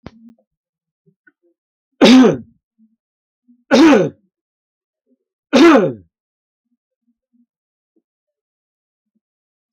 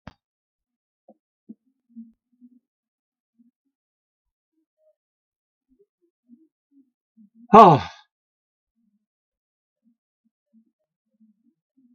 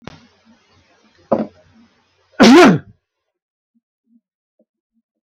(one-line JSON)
{"three_cough_length": "9.7 s", "three_cough_amplitude": 32768, "three_cough_signal_mean_std_ratio": 0.29, "exhalation_length": "11.9 s", "exhalation_amplitude": 32768, "exhalation_signal_mean_std_ratio": 0.12, "cough_length": "5.4 s", "cough_amplitude": 32768, "cough_signal_mean_std_ratio": 0.26, "survey_phase": "beta (2021-08-13 to 2022-03-07)", "age": "65+", "gender": "Male", "wearing_mask": "No", "symptom_none": true, "smoker_status": "Never smoked", "respiratory_condition_asthma": false, "respiratory_condition_other": false, "recruitment_source": "REACT", "submission_delay": "2 days", "covid_test_result": "Negative", "covid_test_method": "RT-qPCR", "influenza_a_test_result": "Negative", "influenza_b_test_result": "Negative"}